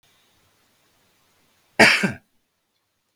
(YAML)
cough_length: 3.2 s
cough_amplitude: 32768
cough_signal_mean_std_ratio: 0.23
survey_phase: beta (2021-08-13 to 2022-03-07)
age: 45-64
gender: Male
wearing_mask: 'No'
symptom_none: true
smoker_status: Never smoked
respiratory_condition_asthma: false
respiratory_condition_other: false
recruitment_source: REACT
submission_delay: 1 day
covid_test_result: Negative
covid_test_method: RT-qPCR
influenza_a_test_result: Negative
influenza_b_test_result: Negative